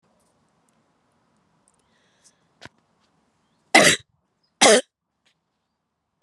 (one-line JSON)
{"cough_length": "6.2 s", "cough_amplitude": 32610, "cough_signal_mean_std_ratio": 0.2, "survey_phase": "beta (2021-08-13 to 2022-03-07)", "age": "45-64", "gender": "Female", "wearing_mask": "No", "symptom_cough_any": true, "symptom_runny_or_blocked_nose": true, "symptom_abdominal_pain": true, "symptom_fatigue": true, "symptom_headache": true, "symptom_change_to_sense_of_smell_or_taste": true, "symptom_loss_of_taste": true, "symptom_onset": "5 days", "smoker_status": "Never smoked", "respiratory_condition_asthma": false, "respiratory_condition_other": false, "recruitment_source": "Test and Trace", "submission_delay": "3 days", "covid_test_result": "Positive", "covid_test_method": "RT-qPCR", "covid_ct_value": 16.6, "covid_ct_gene": "ORF1ab gene", "covid_ct_mean": 17.1, "covid_viral_load": "2400000 copies/ml", "covid_viral_load_category": "High viral load (>1M copies/ml)"}